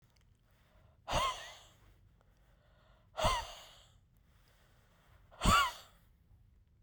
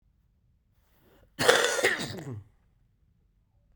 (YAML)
exhalation_length: 6.8 s
exhalation_amplitude: 5181
exhalation_signal_mean_std_ratio: 0.31
cough_length: 3.8 s
cough_amplitude: 28617
cough_signal_mean_std_ratio: 0.34
survey_phase: beta (2021-08-13 to 2022-03-07)
age: 45-64
gender: Male
wearing_mask: 'No'
symptom_cough_any: true
symptom_runny_or_blocked_nose: true
symptom_fever_high_temperature: true
symptom_change_to_sense_of_smell_or_taste: true
symptom_onset: 3 days
smoker_status: Never smoked
respiratory_condition_asthma: true
respiratory_condition_other: false
recruitment_source: Test and Trace
submission_delay: 2 days
covid_test_result: Positive
covid_test_method: RT-qPCR
covid_ct_value: 28.5
covid_ct_gene: ORF1ab gene